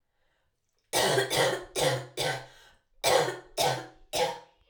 cough_length: 4.7 s
cough_amplitude: 10312
cough_signal_mean_std_ratio: 0.56
survey_phase: alpha (2021-03-01 to 2021-08-12)
age: 18-44
gender: Female
wearing_mask: 'No'
symptom_cough_any: true
symptom_fatigue: true
symptom_change_to_sense_of_smell_or_taste: true
symptom_loss_of_taste: true
symptom_onset: 4 days
smoker_status: Never smoked
respiratory_condition_asthma: false
respiratory_condition_other: false
recruitment_source: Test and Trace
submission_delay: 1 day
covid_test_result: Positive
covid_test_method: RT-qPCR
covid_ct_value: 14.6
covid_ct_gene: N gene
covid_ct_mean: 14.9
covid_viral_load: 13000000 copies/ml
covid_viral_load_category: High viral load (>1M copies/ml)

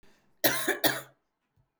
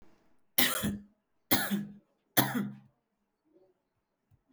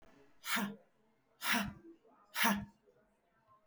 cough_length: 1.8 s
cough_amplitude: 15444
cough_signal_mean_std_ratio: 0.39
three_cough_length: 4.5 s
three_cough_amplitude: 15434
three_cough_signal_mean_std_ratio: 0.36
exhalation_length: 3.7 s
exhalation_amplitude: 4085
exhalation_signal_mean_std_ratio: 0.4
survey_phase: beta (2021-08-13 to 2022-03-07)
age: 18-44
gender: Female
wearing_mask: 'No'
symptom_none: true
symptom_onset: 6 days
smoker_status: Ex-smoker
respiratory_condition_asthma: false
respiratory_condition_other: false
recruitment_source: REACT
submission_delay: 0 days
covid_test_result: Negative
covid_test_method: RT-qPCR
influenza_a_test_result: Unknown/Void
influenza_b_test_result: Unknown/Void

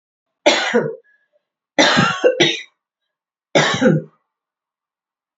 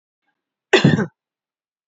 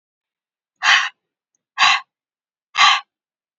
three_cough_length: 5.4 s
three_cough_amplitude: 30308
three_cough_signal_mean_std_ratio: 0.44
cough_length: 1.9 s
cough_amplitude: 28218
cough_signal_mean_std_ratio: 0.3
exhalation_length: 3.6 s
exhalation_amplitude: 29666
exhalation_signal_mean_std_ratio: 0.34
survey_phase: beta (2021-08-13 to 2022-03-07)
age: 45-64
gender: Female
wearing_mask: 'No'
symptom_runny_or_blocked_nose: true
symptom_fatigue: true
smoker_status: Ex-smoker
respiratory_condition_asthma: false
respiratory_condition_other: false
recruitment_source: Test and Trace
submission_delay: 1 day
covid_test_result: Positive
covid_test_method: ePCR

